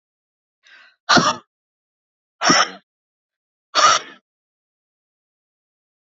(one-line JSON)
{"exhalation_length": "6.1 s", "exhalation_amplitude": 28618, "exhalation_signal_mean_std_ratio": 0.28, "survey_phase": "beta (2021-08-13 to 2022-03-07)", "age": "45-64", "gender": "Female", "wearing_mask": "No", "symptom_cough_any": true, "symptom_onset": "12 days", "smoker_status": "Never smoked", "respiratory_condition_asthma": false, "respiratory_condition_other": false, "recruitment_source": "REACT", "submission_delay": "3 days", "covid_test_result": "Negative", "covid_test_method": "RT-qPCR", "influenza_a_test_result": "Negative", "influenza_b_test_result": "Negative"}